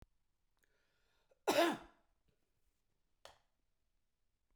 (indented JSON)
{
  "cough_length": "4.6 s",
  "cough_amplitude": 3372,
  "cough_signal_mean_std_ratio": 0.21,
  "survey_phase": "beta (2021-08-13 to 2022-03-07)",
  "age": "65+",
  "gender": "Male",
  "wearing_mask": "No",
  "symptom_none": true,
  "smoker_status": "Never smoked",
  "respiratory_condition_asthma": false,
  "respiratory_condition_other": false,
  "recruitment_source": "REACT",
  "submission_delay": "1 day",
  "covid_test_result": "Negative",
  "covid_test_method": "RT-qPCR"
}